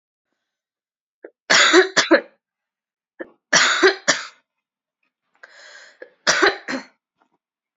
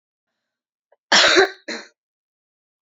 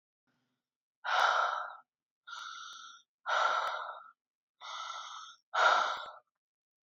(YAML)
three_cough_length: 7.8 s
three_cough_amplitude: 31481
three_cough_signal_mean_std_ratio: 0.34
cough_length: 2.8 s
cough_amplitude: 29624
cough_signal_mean_std_ratio: 0.31
exhalation_length: 6.8 s
exhalation_amplitude: 6342
exhalation_signal_mean_std_ratio: 0.46
survey_phase: alpha (2021-03-01 to 2021-08-12)
age: 18-44
gender: Female
wearing_mask: 'No'
symptom_cough_any: true
symptom_headache: true
symptom_change_to_sense_of_smell_or_taste: true
symptom_onset: 3 days
smoker_status: Never smoked
respiratory_condition_asthma: false
respiratory_condition_other: false
recruitment_source: Test and Trace
submission_delay: 2 days
covid_test_result: Positive
covid_test_method: RT-qPCR
covid_ct_value: 16.2
covid_ct_gene: ORF1ab gene
covid_ct_mean: 17.1
covid_viral_load: 2400000 copies/ml
covid_viral_load_category: High viral load (>1M copies/ml)